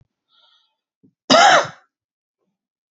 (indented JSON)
{
  "cough_length": "2.9 s",
  "cough_amplitude": 30099,
  "cough_signal_mean_std_ratio": 0.29,
  "survey_phase": "beta (2021-08-13 to 2022-03-07)",
  "age": "45-64",
  "gender": "Male",
  "wearing_mask": "No",
  "symptom_none": true,
  "smoker_status": "Ex-smoker",
  "respiratory_condition_asthma": false,
  "respiratory_condition_other": false,
  "recruitment_source": "REACT",
  "submission_delay": "2 days",
  "covid_test_result": "Negative",
  "covid_test_method": "RT-qPCR",
  "influenza_a_test_result": "Negative",
  "influenza_b_test_result": "Negative"
}